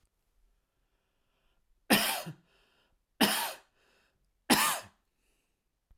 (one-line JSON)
{"three_cough_length": "6.0 s", "three_cough_amplitude": 12576, "three_cough_signal_mean_std_ratio": 0.3, "survey_phase": "alpha (2021-03-01 to 2021-08-12)", "age": "45-64", "gender": "Male", "wearing_mask": "No", "symptom_none": true, "smoker_status": "Never smoked", "respiratory_condition_asthma": false, "respiratory_condition_other": false, "recruitment_source": "REACT", "submission_delay": "2 days", "covid_test_result": "Negative", "covid_test_method": "RT-qPCR"}